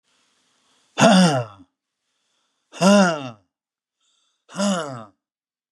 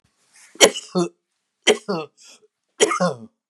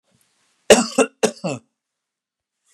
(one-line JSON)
{"exhalation_length": "5.7 s", "exhalation_amplitude": 30642, "exhalation_signal_mean_std_ratio": 0.34, "three_cough_length": "3.5 s", "three_cough_amplitude": 32768, "three_cough_signal_mean_std_ratio": 0.35, "cough_length": "2.7 s", "cough_amplitude": 32768, "cough_signal_mean_std_ratio": 0.26, "survey_phase": "beta (2021-08-13 to 2022-03-07)", "age": "65+", "gender": "Male", "wearing_mask": "No", "symptom_none": true, "smoker_status": "Ex-smoker", "respiratory_condition_asthma": false, "respiratory_condition_other": false, "recruitment_source": "REACT", "submission_delay": "1 day", "covid_test_result": "Negative", "covid_test_method": "RT-qPCR", "influenza_a_test_result": "Negative", "influenza_b_test_result": "Negative"}